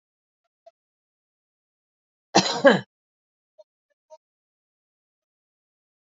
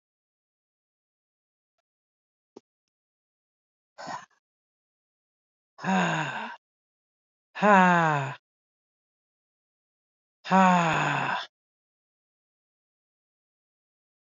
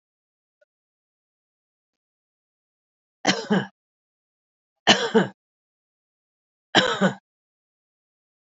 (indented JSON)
{
  "cough_length": "6.1 s",
  "cough_amplitude": 26289,
  "cough_signal_mean_std_ratio": 0.17,
  "exhalation_length": "14.3 s",
  "exhalation_amplitude": 15324,
  "exhalation_signal_mean_std_ratio": 0.29,
  "three_cough_length": "8.4 s",
  "three_cough_amplitude": 27167,
  "three_cough_signal_mean_std_ratio": 0.24,
  "survey_phase": "beta (2021-08-13 to 2022-03-07)",
  "age": "45-64",
  "gender": "Female",
  "wearing_mask": "No",
  "symptom_none": true,
  "smoker_status": "Never smoked",
  "respiratory_condition_asthma": false,
  "respiratory_condition_other": false,
  "recruitment_source": "REACT",
  "submission_delay": "2 days",
  "covid_test_result": "Negative",
  "covid_test_method": "RT-qPCR"
}